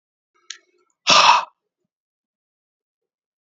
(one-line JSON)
{"exhalation_length": "3.4 s", "exhalation_amplitude": 32115, "exhalation_signal_mean_std_ratio": 0.26, "survey_phase": "beta (2021-08-13 to 2022-03-07)", "age": "45-64", "gender": "Male", "wearing_mask": "No", "symptom_cough_any": true, "symptom_new_continuous_cough": true, "symptom_runny_or_blocked_nose": true, "symptom_sore_throat": true, "symptom_onset": "3 days", "smoker_status": "Never smoked", "respiratory_condition_asthma": false, "respiratory_condition_other": false, "recruitment_source": "Test and Trace", "submission_delay": "-1 day", "covid_test_result": "Positive", "covid_test_method": "RT-qPCR", "covid_ct_value": 18.1, "covid_ct_gene": "N gene"}